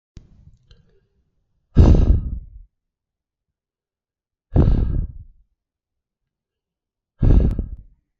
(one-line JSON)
{"exhalation_length": "8.2 s", "exhalation_amplitude": 32768, "exhalation_signal_mean_std_ratio": 0.34, "survey_phase": "beta (2021-08-13 to 2022-03-07)", "age": "45-64", "gender": "Male", "wearing_mask": "No", "symptom_cough_any": true, "symptom_runny_or_blocked_nose": true, "symptom_onset": "12 days", "smoker_status": "Never smoked", "respiratory_condition_asthma": false, "respiratory_condition_other": false, "recruitment_source": "REACT", "submission_delay": "0 days", "covid_test_result": "Negative", "covid_test_method": "RT-qPCR"}